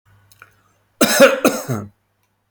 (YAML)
cough_length: 2.5 s
cough_amplitude: 32724
cough_signal_mean_std_ratio: 0.38
survey_phase: alpha (2021-03-01 to 2021-08-12)
age: 45-64
gender: Male
wearing_mask: 'No'
symptom_none: true
smoker_status: Ex-smoker
respiratory_condition_asthma: false
respiratory_condition_other: false
recruitment_source: REACT
submission_delay: 3 days
covid_test_result: Negative
covid_test_method: RT-qPCR